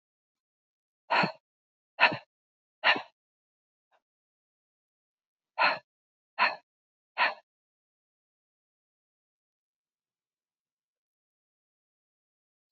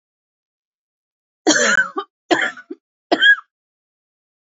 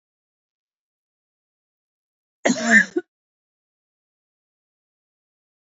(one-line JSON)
{"exhalation_length": "12.7 s", "exhalation_amplitude": 14573, "exhalation_signal_mean_std_ratio": 0.2, "three_cough_length": "4.5 s", "three_cough_amplitude": 27224, "three_cough_signal_mean_std_ratio": 0.35, "cough_length": "5.6 s", "cough_amplitude": 25534, "cough_signal_mean_std_ratio": 0.19, "survey_phase": "beta (2021-08-13 to 2022-03-07)", "age": "45-64", "gender": "Female", "wearing_mask": "No", "symptom_none": true, "smoker_status": "Never smoked", "respiratory_condition_asthma": false, "respiratory_condition_other": false, "recruitment_source": "REACT", "submission_delay": "1 day", "covid_test_result": "Negative", "covid_test_method": "RT-qPCR", "influenza_a_test_result": "Negative", "influenza_b_test_result": "Negative"}